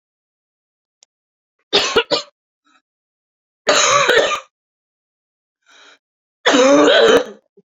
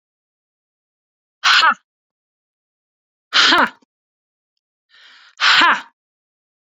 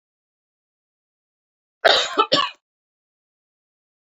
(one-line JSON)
{"three_cough_length": "7.7 s", "three_cough_amplitude": 31107, "three_cough_signal_mean_std_ratio": 0.41, "exhalation_length": "6.7 s", "exhalation_amplitude": 30643, "exhalation_signal_mean_std_ratio": 0.32, "cough_length": "4.0 s", "cough_amplitude": 27538, "cough_signal_mean_std_ratio": 0.26, "survey_phase": "beta (2021-08-13 to 2022-03-07)", "age": "18-44", "gender": "Female", "wearing_mask": "No", "symptom_none": true, "smoker_status": "Ex-smoker", "respiratory_condition_asthma": true, "respiratory_condition_other": false, "recruitment_source": "REACT", "submission_delay": "1 day", "covid_test_result": "Negative", "covid_test_method": "RT-qPCR"}